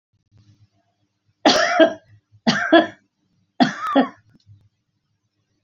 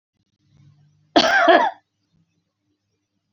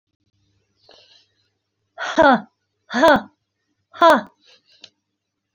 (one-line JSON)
{"three_cough_length": "5.6 s", "three_cough_amplitude": 30055, "three_cough_signal_mean_std_ratio": 0.35, "cough_length": "3.3 s", "cough_amplitude": 29097, "cough_signal_mean_std_ratio": 0.33, "exhalation_length": "5.5 s", "exhalation_amplitude": 28665, "exhalation_signal_mean_std_ratio": 0.28, "survey_phase": "beta (2021-08-13 to 2022-03-07)", "age": "45-64", "gender": "Female", "wearing_mask": "No", "symptom_cough_any": true, "smoker_status": "Never smoked", "respiratory_condition_asthma": false, "respiratory_condition_other": false, "recruitment_source": "REACT", "submission_delay": "1 day", "covid_test_result": "Negative", "covid_test_method": "RT-qPCR"}